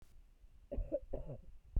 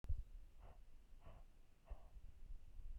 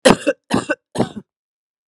cough_length: 1.8 s
cough_amplitude: 2018
cough_signal_mean_std_ratio: 0.5
exhalation_length: 3.0 s
exhalation_amplitude: 851
exhalation_signal_mean_std_ratio: 0.66
three_cough_length: 1.9 s
three_cough_amplitude: 32768
three_cough_signal_mean_std_ratio: 0.35
survey_phase: beta (2021-08-13 to 2022-03-07)
age: 45-64
gender: Female
wearing_mask: 'No'
symptom_cough_any: true
symptom_runny_or_blocked_nose: true
symptom_sore_throat: true
symptom_fatigue: true
symptom_headache: true
symptom_onset: 5 days
smoker_status: Never smoked
respiratory_condition_asthma: false
respiratory_condition_other: false
recruitment_source: Test and Trace
submission_delay: 1 day
covid_test_result: Positive
covid_test_method: RT-qPCR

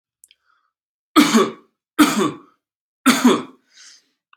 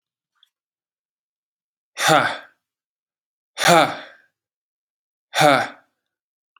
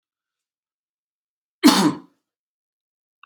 three_cough_length: 4.4 s
three_cough_amplitude: 29772
three_cough_signal_mean_std_ratio: 0.37
exhalation_length: 6.6 s
exhalation_amplitude: 31603
exhalation_signal_mean_std_ratio: 0.29
cough_length: 3.3 s
cough_amplitude: 30241
cough_signal_mean_std_ratio: 0.23
survey_phase: alpha (2021-03-01 to 2021-08-12)
age: 18-44
gender: Male
wearing_mask: 'No'
symptom_none: true
smoker_status: Never smoked
respiratory_condition_asthma: false
respiratory_condition_other: false
recruitment_source: REACT
submission_delay: 1 day
covid_test_result: Negative
covid_test_method: RT-qPCR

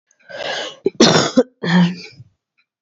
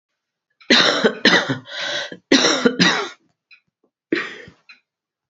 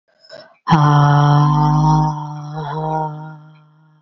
cough_length: 2.8 s
cough_amplitude: 32136
cough_signal_mean_std_ratio: 0.47
three_cough_length: 5.3 s
three_cough_amplitude: 29076
three_cough_signal_mean_std_ratio: 0.46
exhalation_length: 4.0 s
exhalation_amplitude: 32767
exhalation_signal_mean_std_ratio: 0.7
survey_phase: beta (2021-08-13 to 2022-03-07)
age: 18-44
gender: Female
wearing_mask: 'No'
symptom_cough_any: true
symptom_runny_or_blocked_nose: true
symptom_sore_throat: true
symptom_fatigue: true
symptom_change_to_sense_of_smell_or_taste: true
symptom_loss_of_taste: true
symptom_onset: 9 days
smoker_status: Current smoker (11 or more cigarettes per day)
respiratory_condition_asthma: false
respiratory_condition_other: false
recruitment_source: Test and Trace
submission_delay: 6 days
covid_test_result: Positive
covid_test_method: RT-qPCR
covid_ct_value: 25.2
covid_ct_gene: ORF1ab gene
covid_ct_mean: 25.6
covid_viral_load: 4000 copies/ml
covid_viral_load_category: Minimal viral load (< 10K copies/ml)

